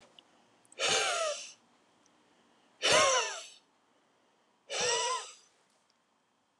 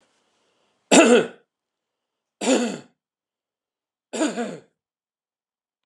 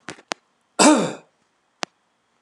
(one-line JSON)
{"exhalation_length": "6.6 s", "exhalation_amplitude": 7417, "exhalation_signal_mean_std_ratio": 0.42, "three_cough_length": "5.9 s", "three_cough_amplitude": 31558, "three_cough_signal_mean_std_ratio": 0.29, "cough_length": "2.4 s", "cough_amplitude": 30465, "cough_signal_mean_std_ratio": 0.28, "survey_phase": "beta (2021-08-13 to 2022-03-07)", "age": "45-64", "gender": "Male", "wearing_mask": "No", "symptom_none": true, "smoker_status": "Ex-smoker", "respiratory_condition_asthma": false, "respiratory_condition_other": false, "recruitment_source": "REACT", "submission_delay": "2 days", "covid_test_result": "Negative", "covid_test_method": "RT-qPCR"}